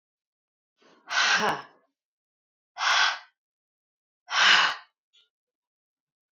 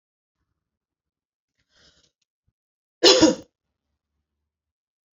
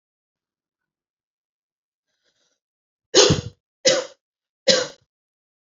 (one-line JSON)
{"exhalation_length": "6.3 s", "exhalation_amplitude": 21663, "exhalation_signal_mean_std_ratio": 0.35, "cough_length": "5.1 s", "cough_amplitude": 28380, "cough_signal_mean_std_ratio": 0.19, "three_cough_length": "5.7 s", "three_cough_amplitude": 31494, "three_cough_signal_mean_std_ratio": 0.25, "survey_phase": "beta (2021-08-13 to 2022-03-07)", "age": "18-44", "gender": "Female", "wearing_mask": "No", "symptom_none": true, "smoker_status": "Ex-smoker", "respiratory_condition_asthma": false, "respiratory_condition_other": false, "recruitment_source": "REACT", "submission_delay": "4 days", "covid_test_result": "Negative", "covid_test_method": "RT-qPCR"}